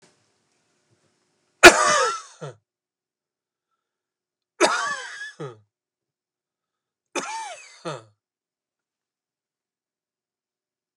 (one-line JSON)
{"three_cough_length": "11.0 s", "three_cough_amplitude": 32768, "three_cough_signal_mean_std_ratio": 0.2, "survey_phase": "beta (2021-08-13 to 2022-03-07)", "age": "45-64", "gender": "Male", "wearing_mask": "No", "symptom_cough_any": true, "symptom_onset": "12 days", "smoker_status": "Never smoked", "respiratory_condition_asthma": false, "respiratory_condition_other": false, "recruitment_source": "REACT", "submission_delay": "1 day", "covid_test_result": "Negative", "covid_test_method": "RT-qPCR"}